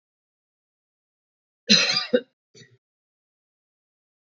{"cough_length": "4.3 s", "cough_amplitude": 25360, "cough_signal_mean_std_ratio": 0.23, "survey_phase": "beta (2021-08-13 to 2022-03-07)", "age": "45-64", "gender": "Female", "wearing_mask": "No", "symptom_none": true, "smoker_status": "Ex-smoker", "respiratory_condition_asthma": false, "respiratory_condition_other": false, "recruitment_source": "REACT", "submission_delay": "4 days", "covid_test_result": "Negative", "covid_test_method": "RT-qPCR", "influenza_a_test_result": "Negative", "influenza_b_test_result": "Negative"}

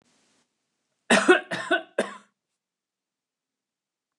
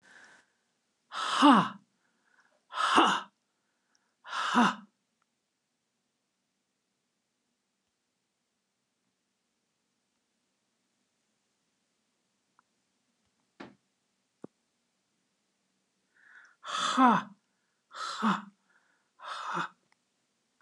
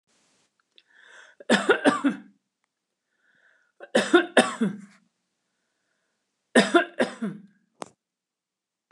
{"cough_length": "4.2 s", "cough_amplitude": 20084, "cough_signal_mean_std_ratio": 0.26, "exhalation_length": "20.6 s", "exhalation_amplitude": 13061, "exhalation_signal_mean_std_ratio": 0.25, "three_cough_length": "8.9 s", "three_cough_amplitude": 24765, "three_cough_signal_mean_std_ratio": 0.31, "survey_phase": "beta (2021-08-13 to 2022-03-07)", "age": "65+", "gender": "Female", "wearing_mask": "No", "symptom_none": true, "smoker_status": "Ex-smoker", "respiratory_condition_asthma": false, "respiratory_condition_other": false, "recruitment_source": "REACT", "submission_delay": "11 days", "covid_test_result": "Negative", "covid_test_method": "RT-qPCR", "influenza_a_test_result": "Negative", "influenza_b_test_result": "Negative"}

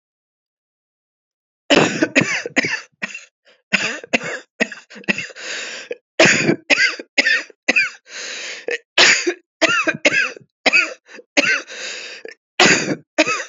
{"cough_length": "13.5 s", "cough_amplitude": 32768, "cough_signal_mean_std_ratio": 0.48, "survey_phase": "alpha (2021-03-01 to 2021-08-12)", "age": "45-64", "gender": "Female", "wearing_mask": "No", "symptom_cough_any": true, "symptom_shortness_of_breath": true, "symptom_abdominal_pain": true, "symptom_fatigue": true, "symptom_headache": true, "symptom_change_to_sense_of_smell_or_taste": true, "symptom_loss_of_taste": true, "smoker_status": "Never smoked", "respiratory_condition_asthma": false, "respiratory_condition_other": false, "recruitment_source": "Test and Trace", "submission_delay": "1 day", "covid_test_result": "Positive", "covid_test_method": "ePCR"}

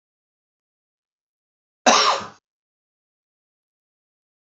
{"cough_length": "4.4 s", "cough_amplitude": 31459, "cough_signal_mean_std_ratio": 0.21, "survey_phase": "alpha (2021-03-01 to 2021-08-12)", "age": "65+", "gender": "Male", "wearing_mask": "No", "symptom_none": true, "smoker_status": "Ex-smoker", "respiratory_condition_asthma": false, "respiratory_condition_other": false, "recruitment_source": "REACT", "submission_delay": "2 days", "covid_test_result": "Negative", "covid_test_method": "RT-qPCR"}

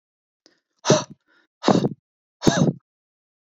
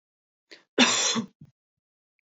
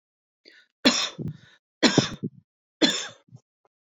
{"exhalation_length": "3.4 s", "exhalation_amplitude": 28031, "exhalation_signal_mean_std_ratio": 0.33, "cough_length": "2.2 s", "cough_amplitude": 23493, "cough_signal_mean_std_ratio": 0.35, "three_cough_length": "3.9 s", "three_cough_amplitude": 23255, "three_cough_signal_mean_std_ratio": 0.34, "survey_phase": "beta (2021-08-13 to 2022-03-07)", "age": "18-44", "gender": "Female", "wearing_mask": "No", "symptom_none": true, "smoker_status": "Ex-smoker", "respiratory_condition_asthma": false, "respiratory_condition_other": false, "recruitment_source": "REACT", "submission_delay": "1 day", "covid_test_result": "Negative", "covid_test_method": "RT-qPCR"}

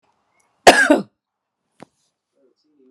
{"cough_length": "2.9 s", "cough_amplitude": 32768, "cough_signal_mean_std_ratio": 0.24, "survey_phase": "alpha (2021-03-01 to 2021-08-12)", "age": "45-64", "gender": "Female", "wearing_mask": "No", "symptom_none": true, "smoker_status": "Never smoked", "respiratory_condition_asthma": false, "respiratory_condition_other": false, "recruitment_source": "REACT", "submission_delay": "1 day", "covid_test_result": "Negative", "covid_test_method": "RT-qPCR"}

